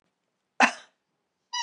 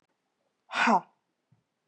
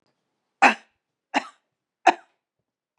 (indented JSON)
{
  "cough_length": "1.6 s",
  "cough_amplitude": 18362,
  "cough_signal_mean_std_ratio": 0.24,
  "exhalation_length": "1.9 s",
  "exhalation_amplitude": 8633,
  "exhalation_signal_mean_std_ratio": 0.3,
  "three_cough_length": "3.0 s",
  "three_cough_amplitude": 26913,
  "three_cough_signal_mean_std_ratio": 0.21,
  "survey_phase": "beta (2021-08-13 to 2022-03-07)",
  "age": "45-64",
  "gender": "Female",
  "wearing_mask": "No",
  "symptom_runny_or_blocked_nose": true,
  "symptom_fatigue": true,
  "smoker_status": "Never smoked",
  "respiratory_condition_asthma": false,
  "respiratory_condition_other": false,
  "recruitment_source": "Test and Trace",
  "submission_delay": "2 days",
  "covid_test_result": "Positive",
  "covid_test_method": "LFT"
}